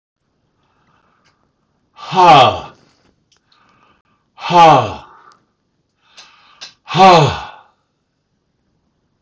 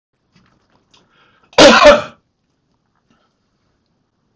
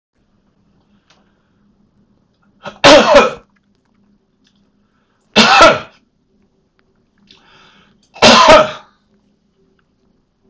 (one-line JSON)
{"exhalation_length": "9.2 s", "exhalation_amplitude": 30277, "exhalation_signal_mean_std_ratio": 0.31, "cough_length": "4.4 s", "cough_amplitude": 30277, "cough_signal_mean_std_ratio": 0.27, "three_cough_length": "10.5 s", "three_cough_amplitude": 30277, "three_cough_signal_mean_std_ratio": 0.31, "survey_phase": "alpha (2021-03-01 to 2021-08-12)", "age": "65+", "gender": "Male", "wearing_mask": "No", "symptom_none": true, "smoker_status": "Never smoked", "respiratory_condition_asthma": false, "respiratory_condition_other": false, "recruitment_source": "REACT", "submission_delay": "2 days", "covid_test_result": "Negative", "covid_test_method": "RT-qPCR"}